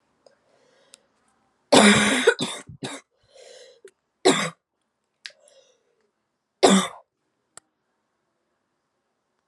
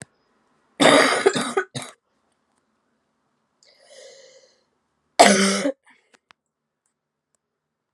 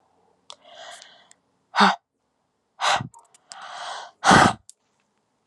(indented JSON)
{
  "three_cough_length": "9.5 s",
  "three_cough_amplitude": 28702,
  "three_cough_signal_mean_std_ratio": 0.27,
  "cough_length": "7.9 s",
  "cough_amplitude": 32768,
  "cough_signal_mean_std_ratio": 0.3,
  "exhalation_length": "5.5 s",
  "exhalation_amplitude": 28840,
  "exhalation_signal_mean_std_ratio": 0.3,
  "survey_phase": "alpha (2021-03-01 to 2021-08-12)",
  "age": "18-44",
  "gender": "Female",
  "wearing_mask": "No",
  "symptom_cough_any": true,
  "symptom_new_continuous_cough": true,
  "symptom_shortness_of_breath": true,
  "symptom_fatigue": true,
  "symptom_headache": true,
  "symptom_onset": "3 days",
  "smoker_status": "Current smoker (e-cigarettes or vapes only)",
  "respiratory_condition_asthma": false,
  "respiratory_condition_other": false,
  "recruitment_source": "Test and Trace",
  "submission_delay": "1 day",
  "covid_test_result": "Positive",
  "covid_test_method": "RT-qPCR",
  "covid_ct_value": 15.3,
  "covid_ct_gene": "ORF1ab gene",
  "covid_ct_mean": 15.7,
  "covid_viral_load": "7000000 copies/ml",
  "covid_viral_load_category": "High viral load (>1M copies/ml)"
}